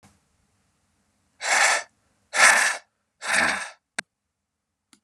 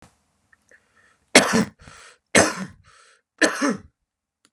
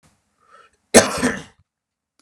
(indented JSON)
{
  "exhalation_length": "5.0 s",
  "exhalation_amplitude": 28128,
  "exhalation_signal_mean_std_ratio": 0.38,
  "three_cough_length": "4.5 s",
  "three_cough_amplitude": 32768,
  "three_cough_signal_mean_std_ratio": 0.31,
  "cough_length": "2.2 s",
  "cough_amplitude": 32768,
  "cough_signal_mean_std_ratio": 0.27,
  "survey_phase": "beta (2021-08-13 to 2022-03-07)",
  "age": "18-44",
  "gender": "Male",
  "wearing_mask": "No",
  "symptom_cough_any": true,
  "symptom_new_continuous_cough": true,
  "symptom_runny_or_blocked_nose": true,
  "symptom_sore_throat": true,
  "symptom_headache": true,
  "symptom_onset": "3 days",
  "smoker_status": "Never smoked",
  "respiratory_condition_asthma": false,
  "respiratory_condition_other": false,
  "recruitment_source": "Test and Trace",
  "submission_delay": "1 day",
  "covid_test_result": "Positive",
  "covid_test_method": "ePCR"
}